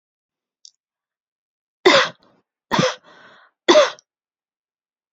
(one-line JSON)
{"three_cough_length": "5.1 s", "three_cough_amplitude": 32767, "three_cough_signal_mean_std_ratio": 0.27, "survey_phase": "beta (2021-08-13 to 2022-03-07)", "age": "18-44", "gender": "Female", "wearing_mask": "No", "symptom_none": true, "smoker_status": "Never smoked", "respiratory_condition_asthma": false, "respiratory_condition_other": false, "recruitment_source": "REACT", "submission_delay": "1 day", "covid_test_result": "Negative", "covid_test_method": "RT-qPCR", "influenza_a_test_result": "Negative", "influenza_b_test_result": "Negative"}